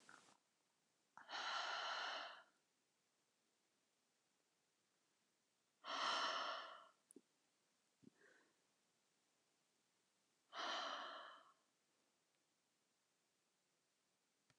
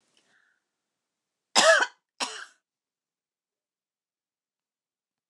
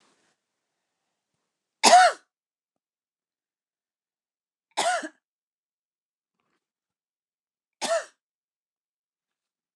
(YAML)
exhalation_length: 14.6 s
exhalation_amplitude: 857
exhalation_signal_mean_std_ratio: 0.37
cough_length: 5.3 s
cough_amplitude: 21047
cough_signal_mean_std_ratio: 0.21
three_cough_length: 9.8 s
three_cough_amplitude: 27172
three_cough_signal_mean_std_ratio: 0.19
survey_phase: beta (2021-08-13 to 2022-03-07)
age: 45-64
gender: Female
wearing_mask: 'No'
symptom_runny_or_blocked_nose: true
symptom_onset: 8 days
smoker_status: Never smoked
respiratory_condition_asthma: false
respiratory_condition_other: false
recruitment_source: REACT
submission_delay: 2 days
covid_test_result: Negative
covid_test_method: RT-qPCR
influenza_a_test_result: Unknown/Void
influenza_b_test_result: Unknown/Void